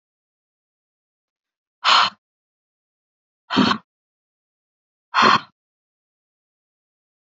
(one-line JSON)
{"exhalation_length": "7.3 s", "exhalation_amplitude": 27162, "exhalation_signal_mean_std_ratio": 0.25, "survey_phase": "alpha (2021-03-01 to 2021-08-12)", "age": "18-44", "gender": "Female", "wearing_mask": "No", "symptom_fatigue": true, "symptom_onset": "12 days", "smoker_status": "Never smoked", "respiratory_condition_asthma": false, "respiratory_condition_other": false, "recruitment_source": "REACT", "submission_delay": "1 day", "covid_test_result": "Negative", "covid_test_method": "RT-qPCR"}